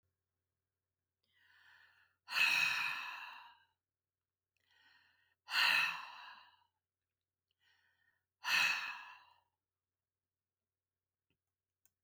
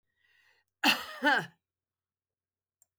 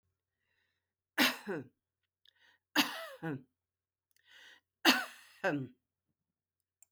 {"exhalation_length": "12.0 s", "exhalation_amplitude": 3668, "exhalation_signal_mean_std_ratio": 0.32, "cough_length": "3.0 s", "cough_amplitude": 9035, "cough_signal_mean_std_ratio": 0.29, "three_cough_length": "6.9 s", "three_cough_amplitude": 11794, "three_cough_signal_mean_std_ratio": 0.29, "survey_phase": "beta (2021-08-13 to 2022-03-07)", "age": "65+", "gender": "Female", "wearing_mask": "No", "symptom_none": true, "smoker_status": "Ex-smoker", "respiratory_condition_asthma": false, "respiratory_condition_other": false, "recruitment_source": "REACT", "submission_delay": "2 days", "covid_test_result": "Negative", "covid_test_method": "RT-qPCR"}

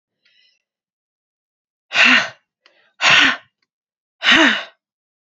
{"exhalation_length": "5.2 s", "exhalation_amplitude": 30459, "exhalation_signal_mean_std_ratio": 0.36, "survey_phase": "beta (2021-08-13 to 2022-03-07)", "age": "18-44", "gender": "Female", "wearing_mask": "No", "symptom_cough_any": true, "symptom_runny_or_blocked_nose": true, "symptom_sore_throat": true, "symptom_fatigue": true, "symptom_headache": true, "symptom_change_to_sense_of_smell_or_taste": true, "symptom_loss_of_taste": true, "symptom_onset": "4 days", "smoker_status": "Ex-smoker", "respiratory_condition_asthma": false, "respiratory_condition_other": false, "recruitment_source": "Test and Trace", "submission_delay": "2 days", "covid_test_result": "Positive", "covid_test_method": "RT-qPCR", "covid_ct_value": 14.7, "covid_ct_gene": "ORF1ab gene", "covid_ct_mean": 15.3, "covid_viral_load": "9800000 copies/ml", "covid_viral_load_category": "High viral load (>1M copies/ml)"}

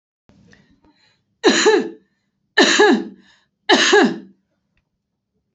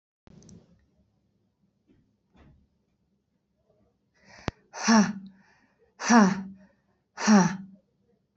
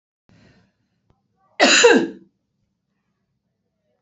{"three_cough_length": "5.5 s", "three_cough_amplitude": 29333, "three_cough_signal_mean_std_ratio": 0.41, "exhalation_length": "8.4 s", "exhalation_amplitude": 14474, "exhalation_signal_mean_std_ratio": 0.29, "cough_length": "4.0 s", "cough_amplitude": 27582, "cough_signal_mean_std_ratio": 0.28, "survey_phase": "alpha (2021-03-01 to 2021-08-12)", "age": "45-64", "gender": "Female", "wearing_mask": "No", "symptom_none": true, "smoker_status": "Never smoked", "respiratory_condition_asthma": false, "respiratory_condition_other": false, "recruitment_source": "REACT", "submission_delay": "1 day", "covid_test_result": "Negative", "covid_test_method": "RT-qPCR"}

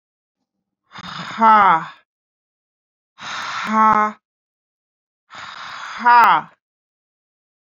{"exhalation_length": "7.8 s", "exhalation_amplitude": 27912, "exhalation_signal_mean_std_ratio": 0.36, "survey_phase": "beta (2021-08-13 to 2022-03-07)", "age": "18-44", "gender": "Female", "wearing_mask": "No", "symptom_sore_throat": true, "symptom_onset": "12 days", "smoker_status": "Ex-smoker", "respiratory_condition_asthma": false, "respiratory_condition_other": false, "recruitment_source": "REACT", "submission_delay": "2 days", "covid_test_result": "Negative", "covid_test_method": "RT-qPCR", "influenza_a_test_result": "Negative", "influenza_b_test_result": "Negative"}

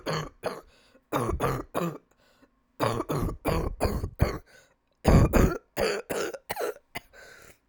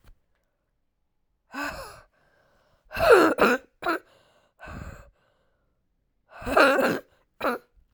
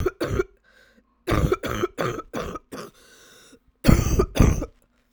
{"three_cough_length": "7.7 s", "three_cough_amplitude": 14556, "three_cough_signal_mean_std_ratio": 0.51, "exhalation_length": "7.9 s", "exhalation_amplitude": 23983, "exhalation_signal_mean_std_ratio": 0.33, "cough_length": "5.1 s", "cough_amplitude": 32767, "cough_signal_mean_std_ratio": 0.45, "survey_phase": "alpha (2021-03-01 to 2021-08-12)", "age": "18-44", "gender": "Female", "wearing_mask": "No", "symptom_cough_any": true, "symptom_shortness_of_breath": true, "symptom_fatigue": true, "symptom_fever_high_temperature": true, "symptom_headache": true, "symptom_change_to_sense_of_smell_or_taste": true, "symptom_loss_of_taste": true, "smoker_status": "Never smoked", "respiratory_condition_asthma": false, "respiratory_condition_other": false, "recruitment_source": "Test and Trace", "submission_delay": "0 days", "covid_test_result": "Positive", "covid_test_method": "LFT"}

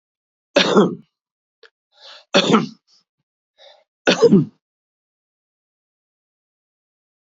{"three_cough_length": "7.3 s", "three_cough_amplitude": 31748, "three_cough_signal_mean_std_ratio": 0.29, "survey_phase": "beta (2021-08-13 to 2022-03-07)", "age": "45-64", "gender": "Male", "wearing_mask": "No", "symptom_cough_any": true, "symptom_runny_or_blocked_nose": true, "symptom_shortness_of_breath": true, "symptom_sore_throat": true, "symptom_headache": true, "symptom_change_to_sense_of_smell_or_taste": true, "smoker_status": "Ex-smoker", "respiratory_condition_asthma": false, "respiratory_condition_other": false, "recruitment_source": "Test and Trace", "submission_delay": "0 days", "covid_test_result": "Positive", "covid_test_method": "LFT"}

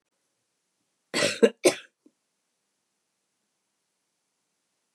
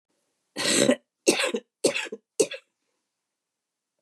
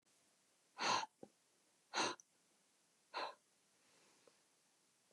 {"cough_length": "4.9 s", "cough_amplitude": 18804, "cough_signal_mean_std_ratio": 0.19, "three_cough_length": "4.0 s", "three_cough_amplitude": 18707, "three_cough_signal_mean_std_ratio": 0.36, "exhalation_length": "5.1 s", "exhalation_amplitude": 2027, "exhalation_signal_mean_std_ratio": 0.3, "survey_phase": "beta (2021-08-13 to 2022-03-07)", "age": "45-64", "gender": "Female", "wearing_mask": "No", "symptom_cough_any": true, "symptom_runny_or_blocked_nose": true, "symptom_shortness_of_breath": true, "symptom_headache": true, "symptom_onset": "2 days", "smoker_status": "Ex-smoker", "respiratory_condition_asthma": true, "respiratory_condition_other": false, "recruitment_source": "Test and Trace", "submission_delay": "1 day", "covid_test_result": "Positive", "covid_test_method": "RT-qPCR", "covid_ct_value": 14.8, "covid_ct_gene": "N gene"}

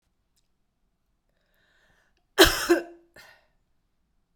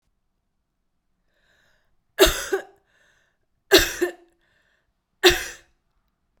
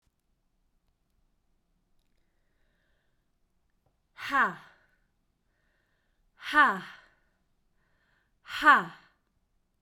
{"cough_length": "4.4 s", "cough_amplitude": 32767, "cough_signal_mean_std_ratio": 0.21, "three_cough_length": "6.4 s", "three_cough_amplitude": 32767, "three_cough_signal_mean_std_ratio": 0.25, "exhalation_length": "9.8 s", "exhalation_amplitude": 15269, "exhalation_signal_mean_std_ratio": 0.21, "survey_phase": "beta (2021-08-13 to 2022-03-07)", "age": "45-64", "gender": "Female", "wearing_mask": "No", "symptom_runny_or_blocked_nose": true, "symptom_sore_throat": true, "symptom_fatigue": true, "symptom_fever_high_temperature": true, "symptom_headache": true, "smoker_status": "Ex-smoker", "respiratory_condition_asthma": false, "respiratory_condition_other": false, "recruitment_source": "Test and Trace", "submission_delay": "2 days", "covid_test_result": "Positive", "covid_test_method": "RT-qPCR", "covid_ct_value": 21.8, "covid_ct_gene": "N gene"}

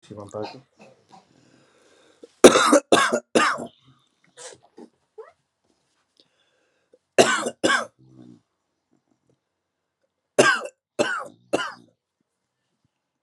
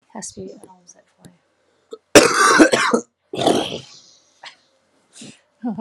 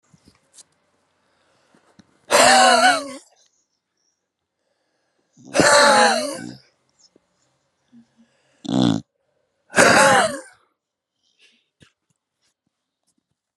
{"three_cough_length": "13.2 s", "three_cough_amplitude": 32768, "three_cough_signal_mean_std_ratio": 0.27, "cough_length": "5.8 s", "cough_amplitude": 32768, "cough_signal_mean_std_ratio": 0.36, "exhalation_length": "13.6 s", "exhalation_amplitude": 32768, "exhalation_signal_mean_std_ratio": 0.34, "survey_phase": "beta (2021-08-13 to 2022-03-07)", "age": "18-44", "gender": "Male", "wearing_mask": "No", "symptom_cough_any": true, "symptom_new_continuous_cough": true, "symptom_runny_or_blocked_nose": true, "symptom_sore_throat": true, "symptom_diarrhoea": true, "symptom_fatigue": true, "symptom_fever_high_temperature": true, "symptom_headache": true, "symptom_change_to_sense_of_smell_or_taste": true, "symptom_onset": "2 days", "smoker_status": "Never smoked", "respiratory_condition_asthma": false, "respiratory_condition_other": false, "recruitment_source": "Test and Trace", "submission_delay": "2 days", "covid_test_result": "Positive", "covid_test_method": "ePCR"}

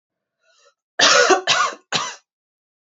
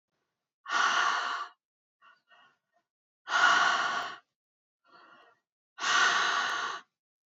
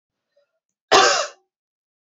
{"three_cough_length": "2.9 s", "three_cough_amplitude": 32542, "three_cough_signal_mean_std_ratio": 0.42, "exhalation_length": "7.3 s", "exhalation_amplitude": 11610, "exhalation_signal_mean_std_ratio": 0.49, "cough_length": "2.0 s", "cough_amplitude": 28319, "cough_signal_mean_std_ratio": 0.31, "survey_phase": "alpha (2021-03-01 to 2021-08-12)", "age": "18-44", "gender": "Female", "wearing_mask": "No", "symptom_none": true, "smoker_status": "Never smoked", "respiratory_condition_asthma": true, "respiratory_condition_other": false, "recruitment_source": "REACT", "submission_delay": "2 days", "covid_test_result": "Negative", "covid_test_method": "RT-qPCR"}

